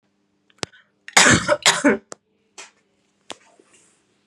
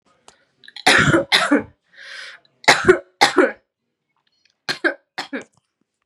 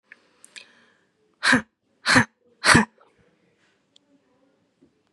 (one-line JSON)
{"cough_length": "4.3 s", "cough_amplitude": 32768, "cough_signal_mean_std_ratio": 0.3, "three_cough_length": "6.1 s", "three_cough_amplitude": 32768, "three_cough_signal_mean_std_ratio": 0.37, "exhalation_length": "5.1 s", "exhalation_amplitude": 31318, "exhalation_signal_mean_std_ratio": 0.26, "survey_phase": "beta (2021-08-13 to 2022-03-07)", "age": "18-44", "gender": "Female", "wearing_mask": "No", "symptom_cough_any": true, "symptom_runny_or_blocked_nose": true, "symptom_fatigue": true, "symptom_headache": true, "smoker_status": "Never smoked", "respiratory_condition_asthma": false, "respiratory_condition_other": false, "recruitment_source": "REACT", "submission_delay": "1 day", "covid_test_result": "Negative", "covid_test_method": "RT-qPCR", "influenza_a_test_result": "Negative", "influenza_b_test_result": "Negative"}